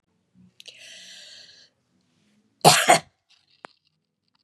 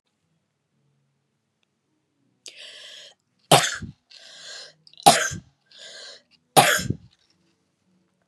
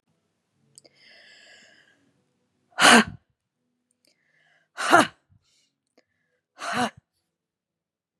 {
  "cough_length": "4.4 s",
  "cough_amplitude": 31147,
  "cough_signal_mean_std_ratio": 0.22,
  "three_cough_length": "8.3 s",
  "three_cough_amplitude": 32768,
  "three_cough_signal_mean_std_ratio": 0.24,
  "exhalation_length": "8.2 s",
  "exhalation_amplitude": 31375,
  "exhalation_signal_mean_std_ratio": 0.21,
  "survey_phase": "beta (2021-08-13 to 2022-03-07)",
  "age": "45-64",
  "gender": "Female",
  "wearing_mask": "No",
  "symptom_none": true,
  "smoker_status": "Never smoked",
  "respiratory_condition_asthma": false,
  "respiratory_condition_other": false,
  "recruitment_source": "Test and Trace",
  "submission_delay": "2 days",
  "covid_test_result": "Negative",
  "covid_test_method": "RT-qPCR"
}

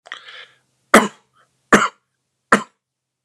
{
  "three_cough_length": "3.2 s",
  "three_cough_amplitude": 32768,
  "three_cough_signal_mean_std_ratio": 0.25,
  "survey_phase": "beta (2021-08-13 to 2022-03-07)",
  "age": "18-44",
  "gender": "Male",
  "wearing_mask": "No",
  "symptom_runny_or_blocked_nose": true,
  "smoker_status": "Never smoked",
  "respiratory_condition_asthma": false,
  "respiratory_condition_other": false,
  "recruitment_source": "REACT",
  "submission_delay": "1 day",
  "covid_test_result": "Negative",
  "covid_test_method": "RT-qPCR",
  "influenza_a_test_result": "Negative",
  "influenza_b_test_result": "Negative"
}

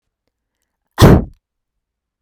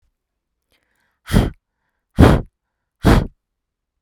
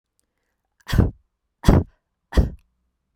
{
  "cough_length": "2.2 s",
  "cough_amplitude": 32768,
  "cough_signal_mean_std_ratio": 0.26,
  "exhalation_length": "4.0 s",
  "exhalation_amplitude": 32768,
  "exhalation_signal_mean_std_ratio": 0.29,
  "three_cough_length": "3.2 s",
  "three_cough_amplitude": 32767,
  "three_cough_signal_mean_std_ratio": 0.29,
  "survey_phase": "beta (2021-08-13 to 2022-03-07)",
  "age": "18-44",
  "gender": "Female",
  "wearing_mask": "No",
  "symptom_fatigue": true,
  "smoker_status": "Never smoked",
  "respiratory_condition_asthma": false,
  "respiratory_condition_other": false,
  "recruitment_source": "REACT",
  "submission_delay": "2 days",
  "covid_test_result": "Negative",
  "covid_test_method": "RT-qPCR",
  "influenza_a_test_result": "Negative",
  "influenza_b_test_result": "Negative"
}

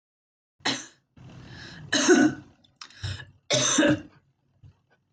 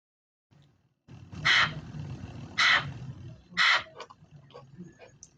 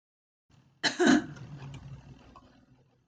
{
  "three_cough_length": "5.1 s",
  "three_cough_amplitude": 14819,
  "three_cough_signal_mean_std_ratio": 0.41,
  "exhalation_length": "5.4 s",
  "exhalation_amplitude": 10308,
  "exhalation_signal_mean_std_ratio": 0.41,
  "cough_length": "3.1 s",
  "cough_amplitude": 10383,
  "cough_signal_mean_std_ratio": 0.33,
  "survey_phase": "beta (2021-08-13 to 2022-03-07)",
  "age": "18-44",
  "gender": "Female",
  "wearing_mask": "No",
  "symptom_none": true,
  "smoker_status": "Current smoker (1 to 10 cigarettes per day)",
  "respiratory_condition_asthma": true,
  "respiratory_condition_other": false,
  "recruitment_source": "REACT",
  "submission_delay": "0 days",
  "covid_test_result": "Negative",
  "covid_test_method": "RT-qPCR"
}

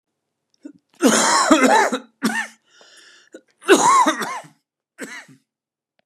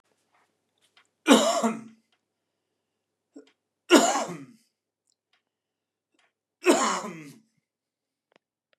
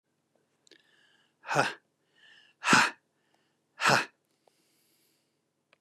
{
  "cough_length": "6.1 s",
  "cough_amplitude": 32767,
  "cough_signal_mean_std_ratio": 0.45,
  "three_cough_length": "8.8 s",
  "three_cough_amplitude": 27056,
  "three_cough_signal_mean_std_ratio": 0.27,
  "exhalation_length": "5.8 s",
  "exhalation_amplitude": 12656,
  "exhalation_signal_mean_std_ratio": 0.26,
  "survey_phase": "beta (2021-08-13 to 2022-03-07)",
  "age": "65+",
  "gender": "Male",
  "wearing_mask": "No",
  "symptom_cough_any": true,
  "symptom_runny_or_blocked_nose": true,
  "symptom_fatigue": true,
  "symptom_headache": true,
  "symptom_onset": "12 days",
  "smoker_status": "Never smoked",
  "respiratory_condition_asthma": false,
  "respiratory_condition_other": false,
  "recruitment_source": "Test and Trace",
  "submission_delay": "1 day",
  "covid_test_result": "Positive",
  "covid_test_method": "RT-qPCR",
  "covid_ct_value": 22.4,
  "covid_ct_gene": "N gene"
}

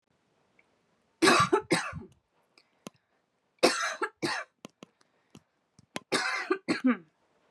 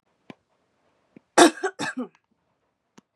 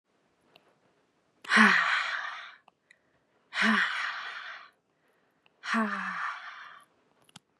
{
  "three_cough_length": "7.5 s",
  "three_cough_amplitude": 16684,
  "three_cough_signal_mean_std_ratio": 0.36,
  "cough_length": "3.2 s",
  "cough_amplitude": 30101,
  "cough_signal_mean_std_ratio": 0.22,
  "exhalation_length": "7.6 s",
  "exhalation_amplitude": 19108,
  "exhalation_signal_mean_std_ratio": 0.41,
  "survey_phase": "beta (2021-08-13 to 2022-03-07)",
  "age": "18-44",
  "gender": "Female",
  "wearing_mask": "No",
  "symptom_none": true,
  "smoker_status": "Never smoked",
  "respiratory_condition_asthma": false,
  "respiratory_condition_other": false,
  "recruitment_source": "REACT",
  "submission_delay": "1 day",
  "covid_test_result": "Negative",
  "covid_test_method": "RT-qPCR",
  "covid_ct_value": 43.0,
  "covid_ct_gene": "E gene"
}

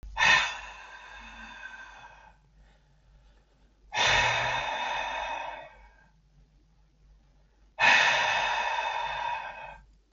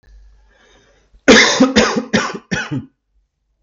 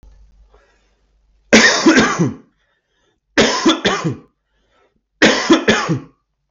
{
  "exhalation_length": "10.1 s",
  "exhalation_amplitude": 13435,
  "exhalation_signal_mean_std_ratio": 0.51,
  "cough_length": "3.6 s",
  "cough_amplitude": 32768,
  "cough_signal_mean_std_ratio": 0.43,
  "three_cough_length": "6.5 s",
  "three_cough_amplitude": 32768,
  "three_cough_signal_mean_std_ratio": 0.47,
  "survey_phase": "beta (2021-08-13 to 2022-03-07)",
  "age": "18-44",
  "gender": "Male",
  "wearing_mask": "No",
  "symptom_cough_any": true,
  "smoker_status": "Never smoked",
  "respiratory_condition_asthma": false,
  "respiratory_condition_other": false,
  "recruitment_source": "REACT",
  "submission_delay": "0 days",
  "covid_test_result": "Negative",
  "covid_test_method": "RT-qPCR",
  "influenza_a_test_result": "Negative",
  "influenza_b_test_result": "Negative"
}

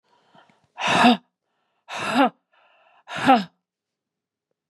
{
  "exhalation_length": "4.7 s",
  "exhalation_amplitude": 25096,
  "exhalation_signal_mean_std_ratio": 0.34,
  "survey_phase": "beta (2021-08-13 to 2022-03-07)",
  "age": "45-64",
  "gender": "Female",
  "wearing_mask": "No",
  "symptom_runny_or_blocked_nose": true,
  "symptom_headache": true,
  "symptom_onset": "4 days",
  "smoker_status": "Ex-smoker",
  "respiratory_condition_asthma": false,
  "respiratory_condition_other": false,
  "recruitment_source": "Test and Trace",
  "submission_delay": "2 days",
  "covid_test_result": "Positive",
  "covid_test_method": "RT-qPCR",
  "covid_ct_value": 23.5,
  "covid_ct_gene": "N gene",
  "covid_ct_mean": 24.5,
  "covid_viral_load": "9000 copies/ml",
  "covid_viral_load_category": "Minimal viral load (< 10K copies/ml)"
}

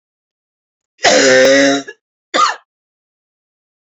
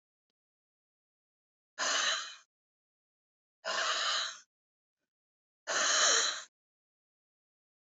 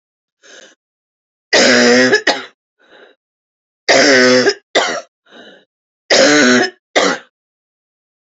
{
  "cough_length": "3.9 s",
  "cough_amplitude": 30521,
  "cough_signal_mean_std_ratio": 0.44,
  "exhalation_length": "7.9 s",
  "exhalation_amplitude": 6208,
  "exhalation_signal_mean_std_ratio": 0.39,
  "three_cough_length": "8.3 s",
  "three_cough_amplitude": 32694,
  "three_cough_signal_mean_std_ratio": 0.48,
  "survey_phase": "beta (2021-08-13 to 2022-03-07)",
  "age": "45-64",
  "gender": "Female",
  "wearing_mask": "No",
  "symptom_cough_any": true,
  "symptom_runny_or_blocked_nose": true,
  "symptom_shortness_of_breath": true,
  "symptom_sore_throat": true,
  "symptom_fatigue": true,
  "symptom_headache": true,
  "symptom_onset": "3 days",
  "smoker_status": "Ex-smoker",
  "respiratory_condition_asthma": false,
  "respiratory_condition_other": false,
  "recruitment_source": "Test and Trace",
  "submission_delay": "2 days",
  "covid_test_result": "Positive",
  "covid_test_method": "ePCR"
}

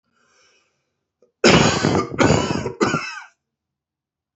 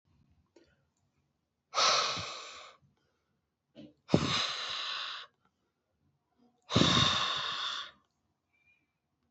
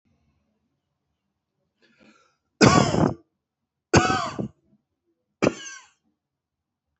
{
  "cough_length": "4.4 s",
  "cough_amplitude": 32767,
  "cough_signal_mean_std_ratio": 0.44,
  "exhalation_length": "9.3 s",
  "exhalation_amplitude": 12467,
  "exhalation_signal_mean_std_ratio": 0.41,
  "three_cough_length": "7.0 s",
  "three_cough_amplitude": 27507,
  "three_cough_signal_mean_std_ratio": 0.28,
  "survey_phase": "beta (2021-08-13 to 2022-03-07)",
  "age": "45-64",
  "gender": "Female",
  "wearing_mask": "No",
  "symptom_none": true,
  "smoker_status": "Current smoker (1 to 10 cigarettes per day)",
  "respiratory_condition_asthma": false,
  "respiratory_condition_other": false,
  "recruitment_source": "REACT",
  "submission_delay": "5 days",
  "covid_test_result": "Negative",
  "covid_test_method": "RT-qPCR"
}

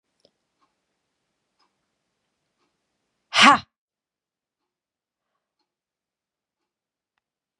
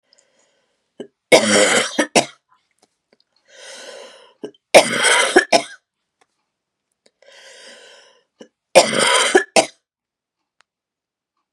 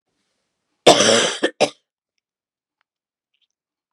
{
  "exhalation_length": "7.6 s",
  "exhalation_amplitude": 30998,
  "exhalation_signal_mean_std_ratio": 0.13,
  "three_cough_length": "11.5 s",
  "three_cough_amplitude": 32768,
  "three_cough_signal_mean_std_ratio": 0.33,
  "cough_length": "3.9 s",
  "cough_amplitude": 32768,
  "cough_signal_mean_std_ratio": 0.29,
  "survey_phase": "beta (2021-08-13 to 2022-03-07)",
  "age": "18-44",
  "gender": "Female",
  "wearing_mask": "No",
  "symptom_cough_any": true,
  "symptom_runny_or_blocked_nose": true,
  "symptom_fatigue": true,
  "symptom_onset": "5 days",
  "smoker_status": "Never smoked",
  "respiratory_condition_asthma": false,
  "respiratory_condition_other": false,
  "recruitment_source": "Test and Trace",
  "submission_delay": "1 day",
  "covid_test_result": "Positive",
  "covid_test_method": "RT-qPCR",
  "covid_ct_value": 27.8,
  "covid_ct_gene": "N gene"
}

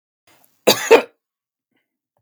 {
  "cough_length": "2.2 s",
  "cough_amplitude": 32768,
  "cough_signal_mean_std_ratio": 0.24,
  "survey_phase": "beta (2021-08-13 to 2022-03-07)",
  "age": "18-44",
  "gender": "Male",
  "wearing_mask": "No",
  "symptom_none": true,
  "smoker_status": "Never smoked",
  "respiratory_condition_asthma": false,
  "respiratory_condition_other": false,
  "recruitment_source": "Test and Trace",
  "submission_delay": "1 day",
  "covid_test_result": "Negative",
  "covid_test_method": "RT-qPCR"
}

